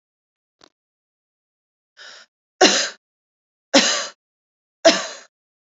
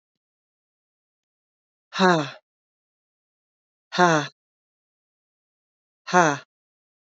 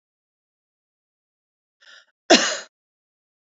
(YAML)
three_cough_length: 5.7 s
three_cough_amplitude: 31131
three_cough_signal_mean_std_ratio: 0.27
exhalation_length: 7.1 s
exhalation_amplitude: 25936
exhalation_signal_mean_std_ratio: 0.24
cough_length: 3.4 s
cough_amplitude: 29145
cough_signal_mean_std_ratio: 0.19
survey_phase: beta (2021-08-13 to 2022-03-07)
age: 45-64
gender: Female
wearing_mask: 'No'
symptom_none: true
smoker_status: Never smoked
respiratory_condition_asthma: false
respiratory_condition_other: false
recruitment_source: REACT
submission_delay: 1 day
covid_test_result: Negative
covid_test_method: RT-qPCR
influenza_a_test_result: Negative
influenza_b_test_result: Negative